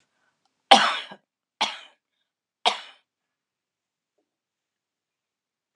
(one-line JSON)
{"cough_length": "5.8 s", "cough_amplitude": 32745, "cough_signal_mean_std_ratio": 0.19, "survey_phase": "alpha (2021-03-01 to 2021-08-12)", "age": "65+", "gender": "Female", "wearing_mask": "No", "symptom_none": true, "smoker_status": "Never smoked", "respiratory_condition_asthma": false, "respiratory_condition_other": false, "recruitment_source": "REACT", "submission_delay": "1 day", "covid_test_result": "Negative", "covid_test_method": "RT-qPCR"}